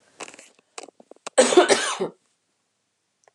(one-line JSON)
{"cough_length": "3.3 s", "cough_amplitude": 26775, "cough_signal_mean_std_ratio": 0.31, "survey_phase": "beta (2021-08-13 to 2022-03-07)", "age": "45-64", "gender": "Female", "wearing_mask": "No", "symptom_fatigue": true, "smoker_status": "Never smoked", "respiratory_condition_asthma": false, "respiratory_condition_other": false, "recruitment_source": "Test and Trace", "submission_delay": "2 days", "covid_test_result": "Positive", "covid_test_method": "RT-qPCR", "covid_ct_value": 37.2, "covid_ct_gene": "ORF1ab gene"}